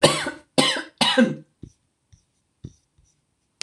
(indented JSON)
{
  "cough_length": "3.6 s",
  "cough_amplitude": 26027,
  "cough_signal_mean_std_ratio": 0.36,
  "survey_phase": "beta (2021-08-13 to 2022-03-07)",
  "age": "65+",
  "gender": "Female",
  "wearing_mask": "No",
  "symptom_none": true,
  "smoker_status": "Ex-smoker",
  "respiratory_condition_asthma": false,
  "respiratory_condition_other": false,
  "recruitment_source": "REACT",
  "submission_delay": "1 day",
  "covid_test_result": "Negative",
  "covid_test_method": "RT-qPCR",
  "influenza_a_test_result": "Negative",
  "influenza_b_test_result": "Negative"
}